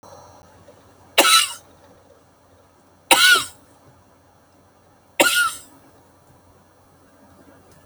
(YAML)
three_cough_length: 7.9 s
three_cough_amplitude: 32768
three_cough_signal_mean_std_ratio: 0.3
survey_phase: alpha (2021-03-01 to 2021-08-12)
age: 65+
gender: Female
wearing_mask: 'No'
symptom_cough_any: true
symptom_shortness_of_breath: true
symptom_abdominal_pain: true
smoker_status: Never smoked
respiratory_condition_asthma: false
respiratory_condition_other: false
recruitment_source: REACT
submission_delay: 2 days
covid_test_result: Negative
covid_test_method: RT-qPCR